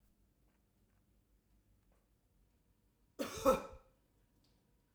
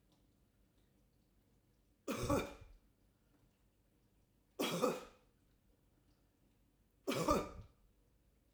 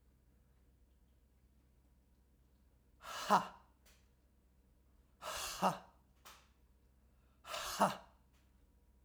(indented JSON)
{
  "cough_length": "4.9 s",
  "cough_amplitude": 4508,
  "cough_signal_mean_std_ratio": 0.2,
  "three_cough_length": "8.5 s",
  "three_cough_amplitude": 3842,
  "three_cough_signal_mean_std_ratio": 0.32,
  "exhalation_length": "9.0 s",
  "exhalation_amplitude": 4724,
  "exhalation_signal_mean_std_ratio": 0.27,
  "survey_phase": "beta (2021-08-13 to 2022-03-07)",
  "age": "45-64",
  "gender": "Female",
  "wearing_mask": "No",
  "symptom_none": true,
  "symptom_onset": "12 days",
  "smoker_status": "Never smoked",
  "respiratory_condition_asthma": false,
  "respiratory_condition_other": false,
  "recruitment_source": "REACT",
  "submission_delay": "1 day",
  "covid_test_result": "Negative",
  "covid_test_method": "RT-qPCR"
}